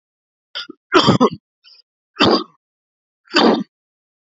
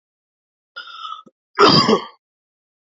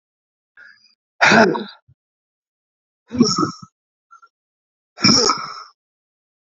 {"three_cough_length": "4.4 s", "three_cough_amplitude": 30720, "three_cough_signal_mean_std_ratio": 0.36, "cough_length": "2.9 s", "cough_amplitude": 31225, "cough_signal_mean_std_ratio": 0.33, "exhalation_length": "6.6 s", "exhalation_amplitude": 31341, "exhalation_signal_mean_std_ratio": 0.33, "survey_phase": "beta (2021-08-13 to 2022-03-07)", "age": "45-64", "gender": "Male", "wearing_mask": "No", "symptom_change_to_sense_of_smell_or_taste": true, "symptom_onset": "4 days", "smoker_status": "Never smoked", "respiratory_condition_asthma": false, "respiratory_condition_other": false, "recruitment_source": "Test and Trace", "submission_delay": "2 days", "covid_test_result": "Positive", "covid_test_method": "RT-qPCR", "covid_ct_value": 17.6, "covid_ct_gene": "ORF1ab gene", "covid_ct_mean": 18.9, "covid_viral_load": "650000 copies/ml", "covid_viral_load_category": "Low viral load (10K-1M copies/ml)"}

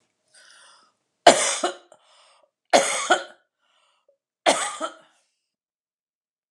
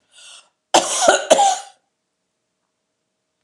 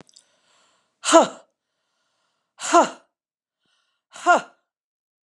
{"three_cough_length": "6.5 s", "three_cough_amplitude": 32768, "three_cough_signal_mean_std_ratio": 0.28, "cough_length": "3.4 s", "cough_amplitude": 32767, "cough_signal_mean_std_ratio": 0.36, "exhalation_length": "5.3 s", "exhalation_amplitude": 31908, "exhalation_signal_mean_std_ratio": 0.25, "survey_phase": "beta (2021-08-13 to 2022-03-07)", "age": "45-64", "gender": "Female", "wearing_mask": "No", "symptom_none": true, "smoker_status": "Ex-smoker", "respiratory_condition_asthma": false, "respiratory_condition_other": false, "recruitment_source": "REACT", "submission_delay": "4 days", "covid_test_result": "Negative", "covid_test_method": "RT-qPCR", "influenza_a_test_result": "Negative", "influenza_b_test_result": "Negative"}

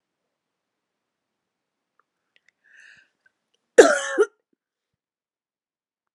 {"cough_length": "6.1 s", "cough_amplitude": 32768, "cough_signal_mean_std_ratio": 0.16, "survey_phase": "beta (2021-08-13 to 2022-03-07)", "age": "45-64", "gender": "Female", "wearing_mask": "No", "symptom_none": true, "smoker_status": "Never smoked", "respiratory_condition_asthma": false, "respiratory_condition_other": false, "recruitment_source": "REACT", "submission_delay": "1 day", "covid_test_result": "Negative", "covid_test_method": "RT-qPCR", "influenza_a_test_result": "Negative", "influenza_b_test_result": "Negative"}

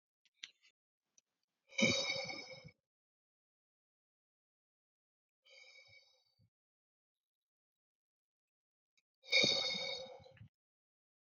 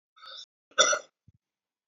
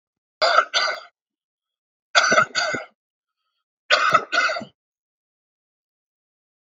{"exhalation_length": "11.3 s", "exhalation_amplitude": 4573, "exhalation_signal_mean_std_ratio": 0.26, "cough_length": "1.9 s", "cough_amplitude": 14851, "cough_signal_mean_std_ratio": 0.27, "three_cough_length": "6.7 s", "three_cough_amplitude": 29897, "three_cough_signal_mean_std_ratio": 0.38, "survey_phase": "beta (2021-08-13 to 2022-03-07)", "age": "45-64", "gender": "Male", "wearing_mask": "No", "symptom_runny_or_blocked_nose": true, "symptom_onset": "5 days", "smoker_status": "Ex-smoker", "respiratory_condition_asthma": false, "respiratory_condition_other": false, "recruitment_source": "Test and Trace", "submission_delay": "2 days", "covid_test_result": "Positive", "covid_test_method": "RT-qPCR", "covid_ct_value": 15.7, "covid_ct_gene": "ORF1ab gene", "covid_ct_mean": 16.2, "covid_viral_load": "5000000 copies/ml", "covid_viral_load_category": "High viral load (>1M copies/ml)"}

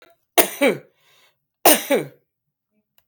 {"three_cough_length": "3.1 s", "three_cough_amplitude": 29894, "three_cough_signal_mean_std_ratio": 0.32, "survey_phase": "beta (2021-08-13 to 2022-03-07)", "age": "45-64", "gender": "Female", "wearing_mask": "No", "symptom_sore_throat": true, "symptom_abdominal_pain": true, "symptom_fatigue": true, "symptom_headache": true, "symptom_change_to_sense_of_smell_or_taste": true, "symptom_onset": "2 days", "smoker_status": "Ex-smoker", "respiratory_condition_asthma": false, "respiratory_condition_other": false, "recruitment_source": "Test and Trace", "submission_delay": "1 day", "covid_test_result": "Positive", "covid_test_method": "RT-qPCR", "covid_ct_value": 18.3, "covid_ct_gene": "ORF1ab gene", "covid_ct_mean": 18.9, "covid_viral_load": "650000 copies/ml", "covid_viral_load_category": "Low viral load (10K-1M copies/ml)"}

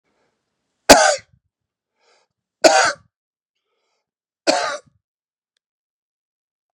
{"three_cough_length": "6.7 s", "three_cough_amplitude": 32768, "three_cough_signal_mean_std_ratio": 0.24, "survey_phase": "beta (2021-08-13 to 2022-03-07)", "age": "45-64", "gender": "Male", "wearing_mask": "No", "symptom_fatigue": true, "smoker_status": "Ex-smoker", "respiratory_condition_asthma": false, "respiratory_condition_other": false, "recruitment_source": "REACT", "submission_delay": "1 day", "covid_test_result": "Negative", "covid_test_method": "RT-qPCR", "influenza_a_test_result": "Negative", "influenza_b_test_result": "Negative"}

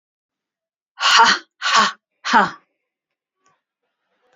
{"exhalation_length": "4.4 s", "exhalation_amplitude": 30752, "exhalation_signal_mean_std_ratio": 0.35, "survey_phase": "beta (2021-08-13 to 2022-03-07)", "age": "45-64", "gender": "Female", "wearing_mask": "No", "symptom_cough_any": true, "symptom_headache": true, "symptom_onset": "12 days", "smoker_status": "Ex-smoker", "respiratory_condition_asthma": false, "respiratory_condition_other": false, "recruitment_source": "REACT", "submission_delay": "1 day", "covid_test_result": "Negative", "covid_test_method": "RT-qPCR", "influenza_a_test_result": "Negative", "influenza_b_test_result": "Negative"}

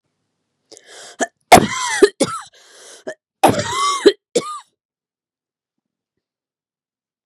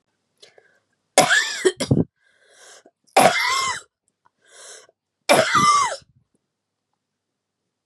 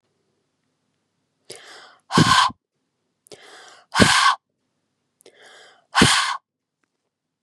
{"cough_length": "7.3 s", "cough_amplitude": 32768, "cough_signal_mean_std_ratio": 0.29, "three_cough_length": "7.9 s", "three_cough_amplitude": 32767, "three_cough_signal_mean_std_ratio": 0.39, "exhalation_length": "7.4 s", "exhalation_amplitude": 32768, "exhalation_signal_mean_std_ratio": 0.32, "survey_phase": "beta (2021-08-13 to 2022-03-07)", "age": "18-44", "gender": "Female", "wearing_mask": "No", "symptom_cough_any": true, "symptom_new_continuous_cough": true, "symptom_sore_throat": true, "symptom_fatigue": true, "symptom_onset": "4 days", "smoker_status": "Never smoked", "respiratory_condition_asthma": false, "respiratory_condition_other": false, "recruitment_source": "Test and Trace", "submission_delay": "2 days", "covid_test_result": "Positive", "covid_test_method": "RT-qPCR", "covid_ct_value": 35.0, "covid_ct_gene": "S gene", "covid_ct_mean": 35.1, "covid_viral_load": "3.1 copies/ml", "covid_viral_load_category": "Minimal viral load (< 10K copies/ml)"}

